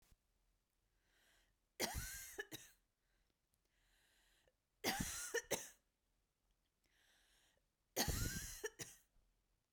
{"three_cough_length": "9.7 s", "three_cough_amplitude": 2461, "three_cough_signal_mean_std_ratio": 0.35, "survey_phase": "beta (2021-08-13 to 2022-03-07)", "age": "18-44", "gender": "Female", "wearing_mask": "No", "symptom_cough_any": true, "symptom_new_continuous_cough": true, "smoker_status": "Never smoked", "respiratory_condition_asthma": false, "respiratory_condition_other": false, "recruitment_source": "Test and Trace", "submission_delay": "2 days", "covid_test_result": "Positive", "covid_test_method": "RT-qPCR"}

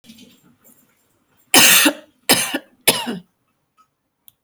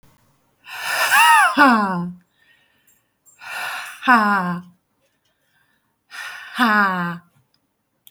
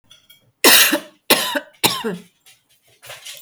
{"three_cough_length": "4.4 s", "three_cough_amplitude": 32768, "three_cough_signal_mean_std_ratio": 0.33, "exhalation_length": "8.1 s", "exhalation_amplitude": 29240, "exhalation_signal_mean_std_ratio": 0.46, "cough_length": "3.4 s", "cough_amplitude": 32768, "cough_signal_mean_std_ratio": 0.39, "survey_phase": "beta (2021-08-13 to 2022-03-07)", "age": "45-64", "gender": "Female", "wearing_mask": "No", "symptom_none": true, "smoker_status": "Never smoked", "respiratory_condition_asthma": false, "respiratory_condition_other": false, "recruitment_source": "REACT", "submission_delay": "1 day", "covid_test_result": "Negative", "covid_test_method": "RT-qPCR"}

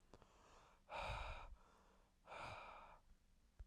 {"exhalation_length": "3.7 s", "exhalation_amplitude": 557, "exhalation_signal_mean_std_ratio": 0.6, "survey_phase": "beta (2021-08-13 to 2022-03-07)", "age": "18-44", "gender": "Male", "wearing_mask": "No", "symptom_cough_any": true, "symptom_new_continuous_cough": true, "symptom_runny_or_blocked_nose": true, "symptom_sore_throat": true, "symptom_change_to_sense_of_smell_or_taste": true, "symptom_onset": "2 days", "smoker_status": "Never smoked", "respiratory_condition_asthma": false, "respiratory_condition_other": false, "recruitment_source": "Test and Trace", "submission_delay": "1 day", "covid_test_result": "Positive", "covid_test_method": "RT-qPCR", "covid_ct_value": 25.5, "covid_ct_gene": "N gene"}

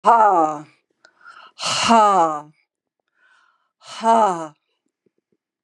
{"exhalation_length": "5.6 s", "exhalation_amplitude": 31562, "exhalation_signal_mean_std_ratio": 0.44, "survey_phase": "beta (2021-08-13 to 2022-03-07)", "age": "65+", "gender": "Female", "wearing_mask": "No", "symptom_none": true, "smoker_status": "Never smoked", "respiratory_condition_asthma": false, "respiratory_condition_other": false, "recruitment_source": "REACT", "submission_delay": "2 days", "covid_test_result": "Negative", "covid_test_method": "RT-qPCR", "influenza_a_test_result": "Negative", "influenza_b_test_result": "Negative"}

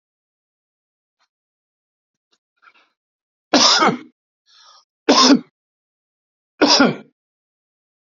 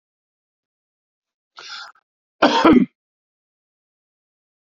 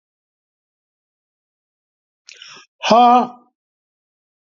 {"three_cough_length": "8.2 s", "three_cough_amplitude": 31142, "three_cough_signal_mean_std_ratio": 0.29, "cough_length": "4.8 s", "cough_amplitude": 29739, "cough_signal_mean_std_ratio": 0.24, "exhalation_length": "4.4 s", "exhalation_amplitude": 32768, "exhalation_signal_mean_std_ratio": 0.26, "survey_phase": "beta (2021-08-13 to 2022-03-07)", "age": "65+", "gender": "Male", "wearing_mask": "No", "symptom_none": true, "smoker_status": "Never smoked", "respiratory_condition_asthma": false, "respiratory_condition_other": false, "recruitment_source": "REACT", "submission_delay": "0 days", "covid_test_result": "Negative", "covid_test_method": "RT-qPCR"}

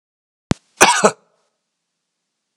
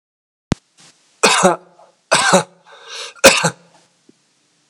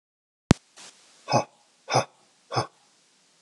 {"cough_length": "2.6 s", "cough_amplitude": 32768, "cough_signal_mean_std_ratio": 0.25, "three_cough_length": "4.7 s", "three_cough_amplitude": 32768, "three_cough_signal_mean_std_ratio": 0.34, "exhalation_length": "3.4 s", "exhalation_amplitude": 32394, "exhalation_signal_mean_std_ratio": 0.24, "survey_phase": "beta (2021-08-13 to 2022-03-07)", "age": "45-64", "gender": "Male", "wearing_mask": "No", "symptom_cough_any": true, "symptom_runny_or_blocked_nose": true, "symptom_onset": "10 days", "smoker_status": "Never smoked", "respiratory_condition_asthma": true, "respiratory_condition_other": false, "recruitment_source": "REACT", "submission_delay": "4 days", "covid_test_result": "Negative", "covid_test_method": "RT-qPCR", "influenza_a_test_result": "Negative", "influenza_b_test_result": "Negative"}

